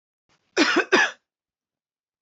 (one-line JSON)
{"cough_length": "2.2 s", "cough_amplitude": 21156, "cough_signal_mean_std_ratio": 0.36, "survey_phase": "beta (2021-08-13 to 2022-03-07)", "age": "18-44", "gender": "Male", "wearing_mask": "No", "symptom_cough_any": true, "symptom_new_continuous_cough": true, "symptom_sore_throat": true, "symptom_fatigue": true, "symptom_onset": "6 days", "smoker_status": "Never smoked", "respiratory_condition_asthma": true, "respiratory_condition_other": false, "recruitment_source": "Test and Trace", "submission_delay": "1 day", "covid_test_result": "Positive", "covid_test_method": "RT-qPCR", "covid_ct_value": 23.9, "covid_ct_gene": "ORF1ab gene"}